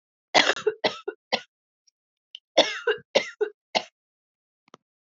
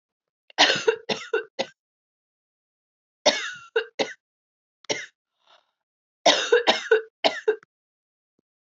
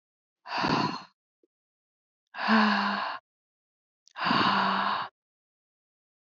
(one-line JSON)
{"cough_length": "5.1 s", "cough_amplitude": 21093, "cough_signal_mean_std_ratio": 0.3, "three_cough_length": "8.7 s", "three_cough_amplitude": 24227, "three_cough_signal_mean_std_ratio": 0.33, "exhalation_length": "6.4 s", "exhalation_amplitude": 8801, "exhalation_signal_mean_std_ratio": 0.48, "survey_phase": "alpha (2021-03-01 to 2021-08-12)", "age": "18-44", "gender": "Female", "wearing_mask": "No", "symptom_new_continuous_cough": true, "symptom_shortness_of_breath": true, "symptom_fatigue": true, "symptom_onset": "2 days", "smoker_status": "Never smoked", "respiratory_condition_asthma": false, "respiratory_condition_other": false, "recruitment_source": "Test and Trace", "submission_delay": "2 days", "covid_test_result": "Positive", "covid_test_method": "RT-qPCR", "covid_ct_value": 21.0, "covid_ct_gene": "N gene", "covid_ct_mean": 21.0, "covid_viral_load": "130000 copies/ml", "covid_viral_load_category": "Low viral load (10K-1M copies/ml)"}